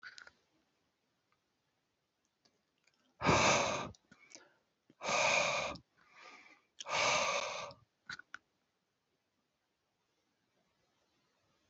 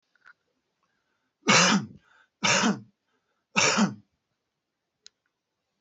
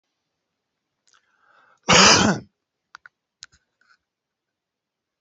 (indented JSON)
{
  "exhalation_length": "11.7 s",
  "exhalation_amplitude": 5164,
  "exhalation_signal_mean_std_ratio": 0.35,
  "three_cough_length": "5.8 s",
  "three_cough_amplitude": 16217,
  "three_cough_signal_mean_std_ratio": 0.35,
  "cough_length": "5.2 s",
  "cough_amplitude": 31147,
  "cough_signal_mean_std_ratio": 0.24,
  "survey_phase": "beta (2021-08-13 to 2022-03-07)",
  "age": "65+",
  "gender": "Male",
  "wearing_mask": "No",
  "symptom_none": true,
  "smoker_status": "Never smoked",
  "respiratory_condition_asthma": false,
  "respiratory_condition_other": false,
  "recruitment_source": "REACT",
  "submission_delay": "2 days",
  "covid_test_result": "Negative",
  "covid_test_method": "RT-qPCR"
}